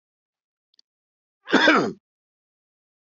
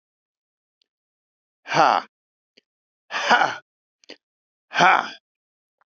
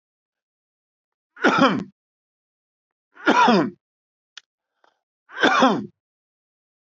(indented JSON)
{
  "cough_length": "3.2 s",
  "cough_amplitude": 23036,
  "cough_signal_mean_std_ratio": 0.27,
  "exhalation_length": "5.9 s",
  "exhalation_amplitude": 24781,
  "exhalation_signal_mean_std_ratio": 0.29,
  "three_cough_length": "6.8 s",
  "three_cough_amplitude": 25991,
  "three_cough_signal_mean_std_ratio": 0.34,
  "survey_phase": "beta (2021-08-13 to 2022-03-07)",
  "age": "65+",
  "gender": "Male",
  "wearing_mask": "No",
  "symptom_none": true,
  "smoker_status": "Ex-smoker",
  "respiratory_condition_asthma": false,
  "respiratory_condition_other": false,
  "recruitment_source": "REACT",
  "submission_delay": "1 day",
  "covid_test_result": "Negative",
  "covid_test_method": "RT-qPCR"
}